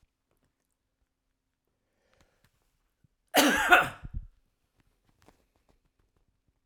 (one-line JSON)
{"cough_length": "6.7 s", "cough_amplitude": 24546, "cough_signal_mean_std_ratio": 0.22, "survey_phase": "alpha (2021-03-01 to 2021-08-12)", "age": "65+", "gender": "Male", "wearing_mask": "No", "symptom_none": true, "smoker_status": "Never smoked", "respiratory_condition_asthma": false, "respiratory_condition_other": false, "recruitment_source": "REACT", "submission_delay": "1 day", "covid_test_result": "Negative", "covid_test_method": "RT-qPCR"}